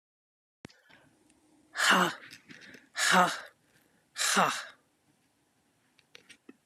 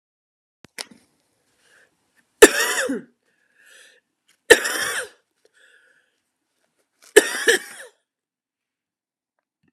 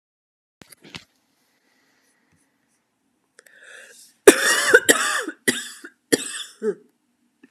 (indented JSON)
{
  "exhalation_length": "6.7 s",
  "exhalation_amplitude": 10798,
  "exhalation_signal_mean_std_ratio": 0.34,
  "three_cough_length": "9.7 s",
  "three_cough_amplitude": 32768,
  "three_cough_signal_mean_std_ratio": 0.21,
  "cough_length": "7.5 s",
  "cough_amplitude": 32768,
  "cough_signal_mean_std_ratio": 0.27,
  "survey_phase": "beta (2021-08-13 to 2022-03-07)",
  "age": "45-64",
  "gender": "Female",
  "wearing_mask": "No",
  "symptom_runny_or_blocked_nose": true,
  "symptom_fatigue": true,
  "smoker_status": "Never smoked",
  "respiratory_condition_asthma": true,
  "respiratory_condition_other": false,
  "recruitment_source": "Test and Trace",
  "submission_delay": "2 days",
  "covid_test_result": "Positive",
  "covid_test_method": "RT-qPCR",
  "covid_ct_value": 14.4,
  "covid_ct_gene": "N gene",
  "covid_ct_mean": 15.6,
  "covid_viral_load": "7700000 copies/ml",
  "covid_viral_load_category": "High viral load (>1M copies/ml)"
}